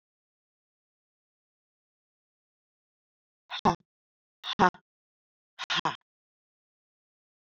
{
  "exhalation_length": "7.6 s",
  "exhalation_amplitude": 13957,
  "exhalation_signal_mean_std_ratio": 0.17,
  "survey_phase": "beta (2021-08-13 to 2022-03-07)",
  "age": "45-64",
  "gender": "Female",
  "wearing_mask": "No",
  "symptom_cough_any": true,
  "symptom_new_continuous_cough": true,
  "symptom_runny_or_blocked_nose": true,
  "symptom_shortness_of_breath": true,
  "symptom_sore_throat": true,
  "symptom_fatigue": true,
  "symptom_headache": true,
  "symptom_change_to_sense_of_smell_or_taste": true,
  "symptom_loss_of_taste": true,
  "symptom_onset": "5 days",
  "smoker_status": "Never smoked",
  "respiratory_condition_asthma": false,
  "respiratory_condition_other": false,
  "recruitment_source": "Test and Trace",
  "submission_delay": "1 day",
  "covid_test_result": "Positive",
  "covid_test_method": "RT-qPCR",
  "covid_ct_value": 22.3,
  "covid_ct_gene": "ORF1ab gene",
  "covid_ct_mean": 23.3,
  "covid_viral_load": "23000 copies/ml",
  "covid_viral_load_category": "Low viral load (10K-1M copies/ml)"
}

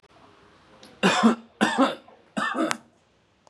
{
  "three_cough_length": "3.5 s",
  "three_cough_amplitude": 21437,
  "three_cough_signal_mean_std_ratio": 0.43,
  "survey_phase": "beta (2021-08-13 to 2022-03-07)",
  "age": "18-44",
  "gender": "Male",
  "wearing_mask": "No",
  "symptom_none": true,
  "symptom_onset": "12 days",
  "smoker_status": "Never smoked",
  "respiratory_condition_asthma": false,
  "respiratory_condition_other": false,
  "recruitment_source": "REACT",
  "submission_delay": "3 days",
  "covid_test_result": "Negative",
  "covid_test_method": "RT-qPCR",
  "influenza_a_test_result": "Negative",
  "influenza_b_test_result": "Negative"
}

